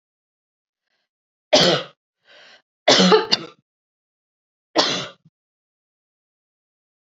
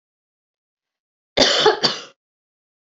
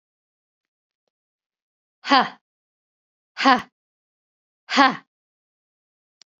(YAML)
three_cough_length: 7.1 s
three_cough_amplitude: 32768
three_cough_signal_mean_std_ratio: 0.29
cough_length: 2.9 s
cough_amplitude: 32768
cough_signal_mean_std_ratio: 0.33
exhalation_length: 6.4 s
exhalation_amplitude: 29090
exhalation_signal_mean_std_ratio: 0.21
survey_phase: beta (2021-08-13 to 2022-03-07)
age: 18-44
gender: Female
wearing_mask: 'No'
symptom_runny_or_blocked_nose: true
symptom_sore_throat: true
symptom_fatigue: true
symptom_headache: true
symptom_onset: 3 days
smoker_status: Ex-smoker
respiratory_condition_asthma: false
respiratory_condition_other: false
recruitment_source: Test and Trace
submission_delay: 2 days
covid_test_result: Positive
covid_test_method: RT-qPCR
covid_ct_value: 22.2
covid_ct_gene: N gene